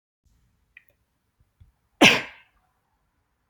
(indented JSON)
{
  "cough_length": "3.5 s",
  "cough_amplitude": 28127,
  "cough_signal_mean_std_ratio": 0.18,
  "survey_phase": "alpha (2021-03-01 to 2021-08-12)",
  "age": "18-44",
  "gender": "Female",
  "wearing_mask": "No",
  "symptom_fatigue": true,
  "symptom_headache": true,
  "smoker_status": "Never smoked",
  "respiratory_condition_asthma": false,
  "respiratory_condition_other": false,
  "recruitment_source": "REACT",
  "submission_delay": "1 day",
  "covid_test_result": "Negative",
  "covid_test_method": "RT-qPCR"
}